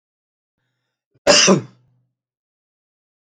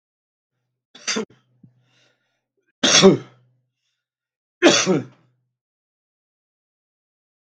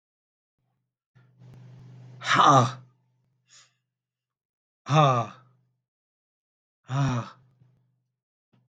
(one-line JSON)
{"cough_length": "3.2 s", "cough_amplitude": 32768, "cough_signal_mean_std_ratio": 0.26, "three_cough_length": "7.5 s", "three_cough_amplitude": 32768, "three_cough_signal_mean_std_ratio": 0.25, "exhalation_length": "8.7 s", "exhalation_amplitude": 16464, "exhalation_signal_mean_std_ratio": 0.29, "survey_phase": "beta (2021-08-13 to 2022-03-07)", "age": "65+", "gender": "Male", "wearing_mask": "No", "symptom_none": true, "smoker_status": "Never smoked", "respiratory_condition_asthma": false, "respiratory_condition_other": true, "recruitment_source": "REACT", "submission_delay": "2 days", "covid_test_result": "Negative", "covid_test_method": "RT-qPCR"}